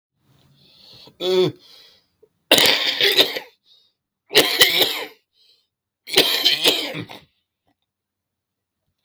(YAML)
three_cough_length: 9.0 s
three_cough_amplitude: 32768
three_cough_signal_mean_std_ratio: 0.41
survey_phase: beta (2021-08-13 to 2022-03-07)
age: 65+
gender: Male
wearing_mask: 'No'
symptom_cough_any: true
symptom_new_continuous_cough: true
symptom_sore_throat: true
symptom_abdominal_pain: true
symptom_fatigue: true
symptom_fever_high_temperature: true
symptom_headache: true
symptom_other: true
symptom_onset: 3 days
smoker_status: Ex-smoker
respiratory_condition_asthma: false
respiratory_condition_other: false
recruitment_source: Test and Trace
submission_delay: 3 days
covid_test_result: Positive
covid_test_method: RT-qPCR
covid_ct_value: 11.7
covid_ct_gene: ORF1ab gene
covid_ct_mean: 12.1
covid_viral_load: 110000000 copies/ml
covid_viral_load_category: High viral load (>1M copies/ml)